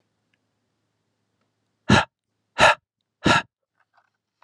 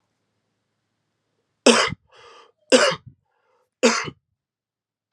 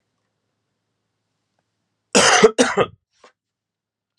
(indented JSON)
{
  "exhalation_length": "4.4 s",
  "exhalation_amplitude": 30221,
  "exhalation_signal_mean_std_ratio": 0.25,
  "three_cough_length": "5.1 s",
  "three_cough_amplitude": 31411,
  "three_cough_signal_mean_std_ratio": 0.27,
  "cough_length": "4.2 s",
  "cough_amplitude": 32767,
  "cough_signal_mean_std_ratio": 0.28,
  "survey_phase": "alpha (2021-03-01 to 2021-08-12)",
  "age": "18-44",
  "gender": "Male",
  "wearing_mask": "No",
  "symptom_cough_any": true,
  "symptom_fatigue": true,
  "symptom_change_to_sense_of_smell_or_taste": true,
  "symptom_loss_of_taste": true,
  "symptom_onset": "5 days",
  "smoker_status": "Never smoked",
  "respiratory_condition_asthma": false,
  "respiratory_condition_other": false,
  "recruitment_source": "Test and Trace",
  "submission_delay": "2 days",
  "covid_test_result": "Positive",
  "covid_test_method": "RT-qPCR",
  "covid_ct_value": 18.6,
  "covid_ct_gene": "N gene",
  "covid_ct_mean": 18.6,
  "covid_viral_load": "770000 copies/ml",
  "covid_viral_load_category": "Low viral load (10K-1M copies/ml)"
}